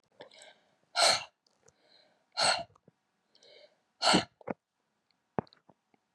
{"exhalation_length": "6.1 s", "exhalation_amplitude": 9126, "exhalation_signal_mean_std_ratio": 0.28, "survey_phase": "beta (2021-08-13 to 2022-03-07)", "age": "65+", "gender": "Female", "wearing_mask": "No", "symptom_none": true, "smoker_status": "Never smoked", "respiratory_condition_asthma": false, "respiratory_condition_other": false, "recruitment_source": "REACT", "submission_delay": "0 days", "covid_test_result": "Negative", "covid_test_method": "RT-qPCR", "influenza_a_test_result": "Negative", "influenza_b_test_result": "Negative"}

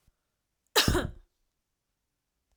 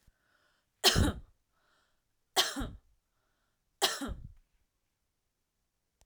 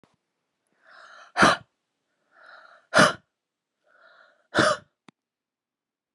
{"cough_length": "2.6 s", "cough_amplitude": 11527, "cough_signal_mean_std_ratio": 0.27, "three_cough_length": "6.1 s", "three_cough_amplitude": 11024, "three_cough_signal_mean_std_ratio": 0.28, "exhalation_length": "6.1 s", "exhalation_amplitude": 21503, "exhalation_signal_mean_std_ratio": 0.24, "survey_phase": "alpha (2021-03-01 to 2021-08-12)", "age": "18-44", "gender": "Female", "wearing_mask": "No", "symptom_cough_any": true, "smoker_status": "Never smoked", "respiratory_condition_asthma": false, "respiratory_condition_other": false, "recruitment_source": "Test and Trace", "submission_delay": "2 days", "covid_test_result": "Positive", "covid_test_method": "RT-qPCR"}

